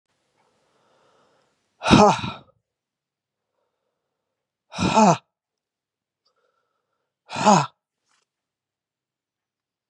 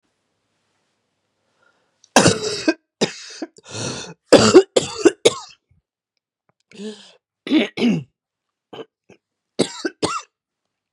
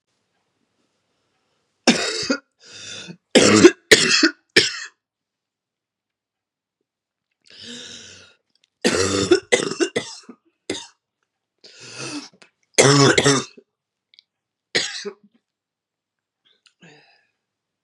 {
  "exhalation_length": "9.9 s",
  "exhalation_amplitude": 30634,
  "exhalation_signal_mean_std_ratio": 0.24,
  "cough_length": "10.9 s",
  "cough_amplitude": 32768,
  "cough_signal_mean_std_ratio": 0.3,
  "three_cough_length": "17.8 s",
  "three_cough_amplitude": 32768,
  "three_cough_signal_mean_std_ratio": 0.31,
  "survey_phase": "beta (2021-08-13 to 2022-03-07)",
  "age": "45-64",
  "gender": "Female",
  "wearing_mask": "No",
  "symptom_cough_any": true,
  "symptom_runny_or_blocked_nose": true,
  "symptom_sore_throat": true,
  "symptom_fatigue": true,
  "symptom_headache": true,
  "symptom_change_to_sense_of_smell_or_taste": true,
  "symptom_onset": "4 days",
  "smoker_status": "Ex-smoker",
  "respiratory_condition_asthma": false,
  "respiratory_condition_other": false,
  "recruitment_source": "Test and Trace",
  "submission_delay": "2 days",
  "covid_test_result": "Positive",
  "covid_test_method": "RT-qPCR",
  "covid_ct_value": 24.0,
  "covid_ct_gene": "N gene"
}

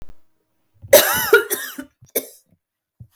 {
  "cough_length": "3.2 s",
  "cough_amplitude": 32768,
  "cough_signal_mean_std_ratio": 0.34,
  "survey_phase": "beta (2021-08-13 to 2022-03-07)",
  "age": "18-44",
  "gender": "Female",
  "wearing_mask": "No",
  "symptom_runny_or_blocked_nose": true,
  "symptom_fatigue": true,
  "symptom_fever_high_temperature": true,
  "symptom_headache": true,
  "smoker_status": "Never smoked",
  "respiratory_condition_asthma": false,
  "respiratory_condition_other": false,
  "recruitment_source": "REACT",
  "submission_delay": "0 days",
  "covid_test_result": "Negative",
  "covid_test_method": "RT-qPCR",
  "influenza_a_test_result": "Negative",
  "influenza_b_test_result": "Negative"
}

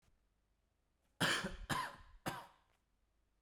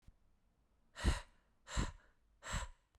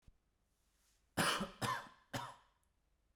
{
  "three_cough_length": "3.4 s",
  "three_cough_amplitude": 2895,
  "three_cough_signal_mean_std_ratio": 0.38,
  "exhalation_length": "3.0 s",
  "exhalation_amplitude": 2938,
  "exhalation_signal_mean_std_ratio": 0.36,
  "cough_length": "3.2 s",
  "cough_amplitude": 3221,
  "cough_signal_mean_std_ratio": 0.38,
  "survey_phase": "beta (2021-08-13 to 2022-03-07)",
  "age": "18-44",
  "gender": "Male",
  "wearing_mask": "No",
  "symptom_cough_any": true,
  "symptom_runny_or_blocked_nose": true,
  "symptom_other": true,
  "smoker_status": "Never smoked",
  "respiratory_condition_asthma": false,
  "respiratory_condition_other": false,
  "recruitment_source": "REACT",
  "submission_delay": "1 day",
  "covid_test_result": "Negative",
  "covid_test_method": "RT-qPCR"
}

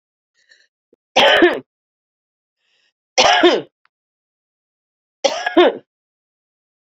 {
  "three_cough_length": "7.0 s",
  "three_cough_amplitude": 29938,
  "three_cough_signal_mean_std_ratio": 0.33,
  "survey_phase": "beta (2021-08-13 to 2022-03-07)",
  "age": "45-64",
  "gender": "Female",
  "wearing_mask": "No",
  "symptom_cough_any": true,
  "symptom_new_continuous_cough": true,
  "symptom_runny_or_blocked_nose": true,
  "symptom_diarrhoea": true,
  "symptom_change_to_sense_of_smell_or_taste": true,
  "symptom_loss_of_taste": true,
  "symptom_onset": "4 days",
  "smoker_status": "Ex-smoker",
  "respiratory_condition_asthma": false,
  "respiratory_condition_other": false,
  "recruitment_source": "Test and Trace",
  "submission_delay": "1 day",
  "covid_test_result": "Positive",
  "covid_test_method": "RT-qPCR",
  "covid_ct_value": 13.2,
  "covid_ct_gene": "ORF1ab gene",
  "covid_ct_mean": 13.8,
  "covid_viral_load": "31000000 copies/ml",
  "covid_viral_load_category": "High viral load (>1M copies/ml)"
}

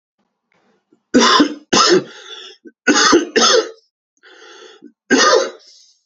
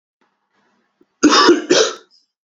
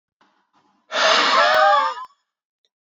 {
  "three_cough_length": "6.1 s",
  "three_cough_amplitude": 32767,
  "three_cough_signal_mean_std_ratio": 0.48,
  "cough_length": "2.5 s",
  "cough_amplitude": 30326,
  "cough_signal_mean_std_ratio": 0.41,
  "exhalation_length": "3.0 s",
  "exhalation_amplitude": 24428,
  "exhalation_signal_mean_std_ratio": 0.52,
  "survey_phase": "beta (2021-08-13 to 2022-03-07)",
  "age": "18-44",
  "gender": "Male",
  "wearing_mask": "No",
  "symptom_cough_any": true,
  "symptom_runny_or_blocked_nose": true,
  "symptom_sore_throat": true,
  "symptom_headache": true,
  "symptom_onset": "2 days",
  "smoker_status": "Never smoked",
  "respiratory_condition_asthma": false,
  "respiratory_condition_other": false,
  "recruitment_source": "Test and Trace",
  "submission_delay": "2 days",
  "covid_test_result": "Positive",
  "covid_test_method": "RT-qPCR",
  "covid_ct_value": 24.1,
  "covid_ct_gene": "ORF1ab gene"
}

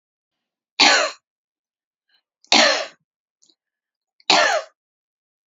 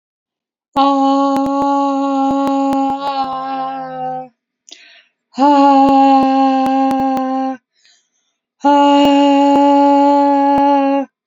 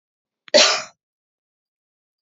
{
  "three_cough_length": "5.5 s",
  "three_cough_amplitude": 32360,
  "three_cough_signal_mean_std_ratio": 0.32,
  "exhalation_length": "11.3 s",
  "exhalation_amplitude": 28549,
  "exhalation_signal_mean_std_ratio": 0.87,
  "cough_length": "2.2 s",
  "cough_amplitude": 30602,
  "cough_signal_mean_std_ratio": 0.26,
  "survey_phase": "beta (2021-08-13 to 2022-03-07)",
  "age": "45-64",
  "gender": "Female",
  "wearing_mask": "No",
  "symptom_none": true,
  "smoker_status": "Never smoked",
  "respiratory_condition_asthma": false,
  "respiratory_condition_other": false,
  "recruitment_source": "Test and Trace",
  "submission_delay": "2 days",
  "covid_test_result": "Positive",
  "covid_test_method": "RT-qPCR",
  "covid_ct_value": 29.4,
  "covid_ct_gene": "N gene"
}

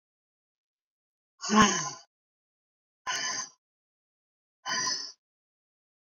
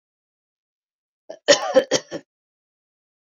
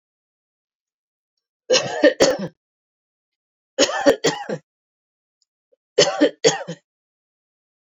{
  "exhalation_length": "6.1 s",
  "exhalation_amplitude": 13183,
  "exhalation_signal_mean_std_ratio": 0.3,
  "cough_length": "3.3 s",
  "cough_amplitude": 29765,
  "cough_signal_mean_std_ratio": 0.24,
  "three_cough_length": "7.9 s",
  "three_cough_amplitude": 28510,
  "three_cough_signal_mean_std_ratio": 0.33,
  "survey_phase": "beta (2021-08-13 to 2022-03-07)",
  "age": "65+",
  "gender": "Female",
  "wearing_mask": "No",
  "symptom_none": true,
  "smoker_status": "Never smoked",
  "respiratory_condition_asthma": false,
  "respiratory_condition_other": false,
  "recruitment_source": "REACT",
  "submission_delay": "1 day",
  "covid_test_result": "Negative",
  "covid_test_method": "RT-qPCR",
  "influenza_a_test_result": "Negative",
  "influenza_b_test_result": "Negative"
}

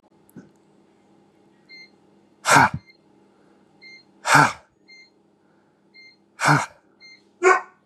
{
  "exhalation_length": "7.9 s",
  "exhalation_amplitude": 31416,
  "exhalation_signal_mean_std_ratio": 0.28,
  "survey_phase": "beta (2021-08-13 to 2022-03-07)",
  "age": "18-44",
  "gender": "Male",
  "wearing_mask": "No",
  "symptom_cough_any": true,
  "symptom_runny_or_blocked_nose": true,
  "symptom_onset": "10 days",
  "smoker_status": "Never smoked",
  "respiratory_condition_asthma": false,
  "respiratory_condition_other": false,
  "recruitment_source": "REACT",
  "submission_delay": "2 days",
  "covid_test_result": "Negative",
  "covid_test_method": "RT-qPCR",
  "influenza_a_test_result": "Negative",
  "influenza_b_test_result": "Negative"
}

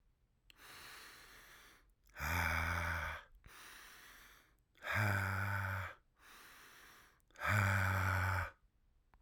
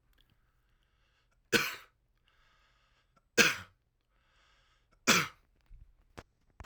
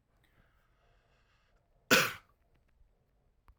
{
  "exhalation_length": "9.2 s",
  "exhalation_amplitude": 2987,
  "exhalation_signal_mean_std_ratio": 0.56,
  "three_cough_length": "6.7 s",
  "three_cough_amplitude": 15671,
  "three_cough_signal_mean_std_ratio": 0.22,
  "cough_length": "3.6 s",
  "cough_amplitude": 10364,
  "cough_signal_mean_std_ratio": 0.19,
  "survey_phase": "alpha (2021-03-01 to 2021-08-12)",
  "age": "45-64",
  "gender": "Male",
  "wearing_mask": "No",
  "symptom_none": true,
  "smoker_status": "Ex-smoker",
  "respiratory_condition_asthma": false,
  "respiratory_condition_other": false,
  "recruitment_source": "REACT",
  "submission_delay": "1 day",
  "covid_test_result": "Negative",
  "covid_test_method": "RT-qPCR"
}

